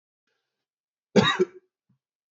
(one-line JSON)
{"cough_length": "2.3 s", "cough_amplitude": 18775, "cough_signal_mean_std_ratio": 0.26, "survey_phase": "beta (2021-08-13 to 2022-03-07)", "age": "18-44", "gender": "Male", "wearing_mask": "No", "symptom_cough_any": true, "symptom_runny_or_blocked_nose": true, "symptom_sore_throat": true, "symptom_abdominal_pain": true, "symptom_headache": true, "symptom_onset": "12 days", "smoker_status": "Never smoked", "respiratory_condition_asthma": false, "respiratory_condition_other": false, "recruitment_source": "REACT", "submission_delay": "1 day", "covid_test_result": "Positive", "covid_test_method": "RT-qPCR", "covid_ct_value": 25.0, "covid_ct_gene": "E gene", "influenza_a_test_result": "Negative", "influenza_b_test_result": "Negative"}